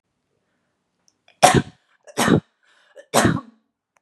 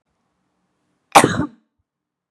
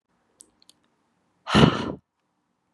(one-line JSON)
{"three_cough_length": "4.0 s", "three_cough_amplitude": 32768, "three_cough_signal_mean_std_ratio": 0.31, "cough_length": "2.3 s", "cough_amplitude": 32768, "cough_signal_mean_std_ratio": 0.23, "exhalation_length": "2.7 s", "exhalation_amplitude": 28101, "exhalation_signal_mean_std_ratio": 0.26, "survey_phase": "beta (2021-08-13 to 2022-03-07)", "age": "18-44", "gender": "Female", "wearing_mask": "No", "symptom_shortness_of_breath": true, "symptom_sore_throat": true, "symptom_abdominal_pain": true, "symptom_fatigue": true, "symptom_fever_high_temperature": true, "symptom_headache": true, "symptom_other": true, "symptom_onset": "5 days", "smoker_status": "Never smoked", "respiratory_condition_asthma": false, "respiratory_condition_other": false, "recruitment_source": "Test and Trace", "submission_delay": "1 day", "covid_test_result": "Positive", "covid_test_method": "RT-qPCR", "covid_ct_value": 27.3, "covid_ct_gene": "N gene", "covid_ct_mean": 27.8, "covid_viral_load": "760 copies/ml", "covid_viral_load_category": "Minimal viral load (< 10K copies/ml)"}